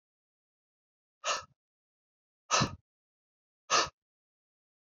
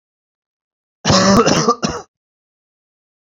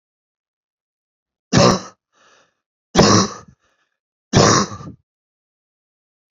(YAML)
exhalation_length: 4.9 s
exhalation_amplitude: 6589
exhalation_signal_mean_std_ratio: 0.24
cough_length: 3.3 s
cough_amplitude: 32768
cough_signal_mean_std_ratio: 0.4
three_cough_length: 6.3 s
three_cough_amplitude: 30668
three_cough_signal_mean_std_ratio: 0.31
survey_phase: beta (2021-08-13 to 2022-03-07)
age: 45-64
gender: Male
wearing_mask: 'No'
symptom_cough_any: true
symptom_onset: 12 days
smoker_status: Never smoked
respiratory_condition_asthma: false
respiratory_condition_other: false
recruitment_source: REACT
submission_delay: 1 day
covid_test_result: Negative
covid_test_method: RT-qPCR
influenza_a_test_result: Negative
influenza_b_test_result: Negative